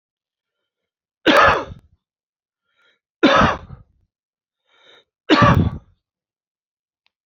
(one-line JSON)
{"three_cough_length": "7.3 s", "three_cough_amplitude": 30912, "three_cough_signal_mean_std_ratio": 0.32, "survey_phase": "beta (2021-08-13 to 2022-03-07)", "age": "65+", "gender": "Male", "wearing_mask": "No", "symptom_none": true, "smoker_status": "Never smoked", "respiratory_condition_asthma": false, "respiratory_condition_other": false, "recruitment_source": "REACT", "submission_delay": "1 day", "covid_test_result": "Negative", "covid_test_method": "RT-qPCR"}